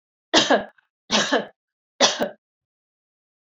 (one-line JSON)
{"three_cough_length": "3.4 s", "three_cough_amplitude": 30359, "three_cough_signal_mean_std_ratio": 0.37, "survey_phase": "beta (2021-08-13 to 2022-03-07)", "age": "45-64", "gender": "Female", "wearing_mask": "No", "symptom_cough_any": true, "symptom_runny_or_blocked_nose": true, "symptom_sore_throat": true, "symptom_fever_high_temperature": true, "symptom_headache": true, "symptom_change_to_sense_of_smell_or_taste": true, "symptom_onset": "2 days", "smoker_status": "Never smoked", "respiratory_condition_asthma": false, "respiratory_condition_other": false, "recruitment_source": "Test and Trace", "submission_delay": "0 days", "covid_test_result": "Positive", "covid_test_method": "RT-qPCR", "covid_ct_value": 21.5, "covid_ct_gene": "ORF1ab gene", "covid_ct_mean": 21.6, "covid_viral_load": "83000 copies/ml", "covid_viral_load_category": "Low viral load (10K-1M copies/ml)"}